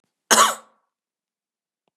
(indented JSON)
{
  "cough_length": "2.0 s",
  "cough_amplitude": 32768,
  "cough_signal_mean_std_ratio": 0.26,
  "survey_phase": "beta (2021-08-13 to 2022-03-07)",
  "age": "65+",
  "gender": "Female",
  "wearing_mask": "No",
  "symptom_none": true,
  "smoker_status": "Never smoked",
  "respiratory_condition_asthma": false,
  "respiratory_condition_other": false,
  "recruitment_source": "REACT",
  "submission_delay": "1 day",
  "covid_test_result": "Negative",
  "covid_test_method": "RT-qPCR",
  "influenza_a_test_result": "Negative",
  "influenza_b_test_result": "Negative"
}